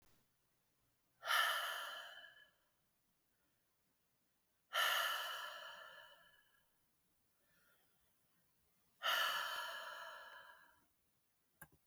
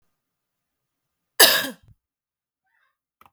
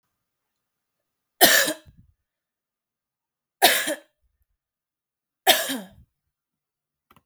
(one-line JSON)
{"exhalation_length": "11.9 s", "exhalation_amplitude": 2164, "exhalation_signal_mean_std_ratio": 0.4, "cough_length": "3.3 s", "cough_amplitude": 32768, "cough_signal_mean_std_ratio": 0.2, "three_cough_length": "7.3 s", "three_cough_amplitude": 32766, "three_cough_signal_mean_std_ratio": 0.25, "survey_phase": "beta (2021-08-13 to 2022-03-07)", "age": "45-64", "gender": "Female", "wearing_mask": "No", "symptom_cough_any": true, "symptom_sore_throat": true, "symptom_fever_high_temperature": true, "symptom_headache": true, "symptom_change_to_sense_of_smell_or_taste": true, "smoker_status": "Never smoked", "respiratory_condition_asthma": false, "respiratory_condition_other": false, "recruitment_source": "Test and Trace", "submission_delay": "1 day", "covid_test_result": "Positive", "covid_test_method": "RT-qPCR", "covid_ct_value": 31.0, "covid_ct_gene": "ORF1ab gene", "covid_ct_mean": 32.8, "covid_viral_load": "17 copies/ml", "covid_viral_load_category": "Minimal viral load (< 10K copies/ml)"}